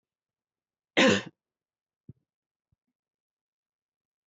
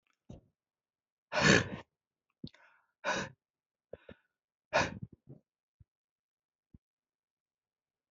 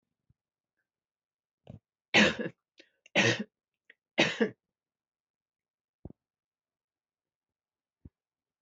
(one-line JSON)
{"cough_length": "4.3 s", "cough_amplitude": 11287, "cough_signal_mean_std_ratio": 0.19, "exhalation_length": "8.1 s", "exhalation_amplitude": 9405, "exhalation_signal_mean_std_ratio": 0.23, "three_cough_length": "8.6 s", "three_cough_amplitude": 12806, "three_cough_signal_mean_std_ratio": 0.22, "survey_phase": "beta (2021-08-13 to 2022-03-07)", "age": "45-64", "gender": "Female", "wearing_mask": "No", "symptom_sore_throat": true, "symptom_loss_of_taste": true, "symptom_onset": "3 days", "smoker_status": "Never smoked", "respiratory_condition_asthma": false, "respiratory_condition_other": false, "recruitment_source": "Test and Trace", "submission_delay": "2 days", "covid_test_result": "Positive", "covid_test_method": "RT-qPCR", "covid_ct_value": 18.4, "covid_ct_gene": "ORF1ab gene", "covid_ct_mean": 18.7, "covid_viral_load": "750000 copies/ml", "covid_viral_load_category": "Low viral load (10K-1M copies/ml)"}